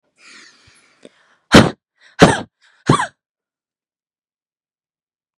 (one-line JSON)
{"exhalation_length": "5.4 s", "exhalation_amplitude": 32768, "exhalation_signal_mean_std_ratio": 0.23, "survey_phase": "beta (2021-08-13 to 2022-03-07)", "age": "18-44", "gender": "Female", "wearing_mask": "No", "symptom_runny_or_blocked_nose": true, "symptom_shortness_of_breath": true, "symptom_sore_throat": true, "symptom_fatigue": true, "symptom_headache": true, "symptom_onset": "2 days", "smoker_status": "Never smoked", "respiratory_condition_asthma": true, "respiratory_condition_other": false, "recruitment_source": "Test and Trace", "submission_delay": "0 days", "covid_test_result": "Negative", "covid_test_method": "ePCR"}